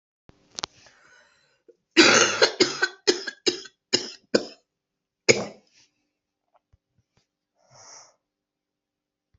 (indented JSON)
{
  "cough_length": "9.4 s",
  "cough_amplitude": 26756,
  "cough_signal_mean_std_ratio": 0.26,
  "survey_phase": "alpha (2021-03-01 to 2021-08-12)",
  "age": "18-44",
  "gender": "Female",
  "wearing_mask": "No",
  "symptom_cough_any": true,
  "symptom_new_continuous_cough": true,
  "symptom_abdominal_pain": true,
  "symptom_diarrhoea": true,
  "symptom_fever_high_temperature": true,
  "smoker_status": "Ex-smoker",
  "respiratory_condition_asthma": false,
  "respiratory_condition_other": false,
  "recruitment_source": "Test and Trace",
  "submission_delay": "1 day",
  "covid_test_result": "Positive",
  "covid_test_method": "RT-qPCR",
  "covid_ct_value": 17.6,
  "covid_ct_gene": "ORF1ab gene",
  "covid_ct_mean": 18.0,
  "covid_viral_load": "1200000 copies/ml",
  "covid_viral_load_category": "High viral load (>1M copies/ml)"
}